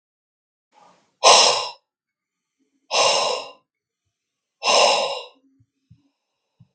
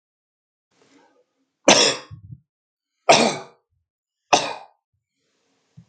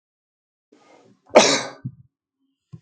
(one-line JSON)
{"exhalation_length": "6.7 s", "exhalation_amplitude": 32768, "exhalation_signal_mean_std_ratio": 0.35, "three_cough_length": "5.9 s", "three_cough_amplitude": 32760, "three_cough_signal_mean_std_ratio": 0.26, "cough_length": "2.8 s", "cough_amplitude": 32698, "cough_signal_mean_std_ratio": 0.24, "survey_phase": "beta (2021-08-13 to 2022-03-07)", "age": "65+", "gender": "Male", "wearing_mask": "No", "symptom_sore_throat": true, "symptom_onset": "12 days", "smoker_status": "Ex-smoker", "respiratory_condition_asthma": false, "respiratory_condition_other": false, "recruitment_source": "REACT", "submission_delay": "1 day", "covid_test_result": "Negative", "covid_test_method": "RT-qPCR", "influenza_a_test_result": "Negative", "influenza_b_test_result": "Negative"}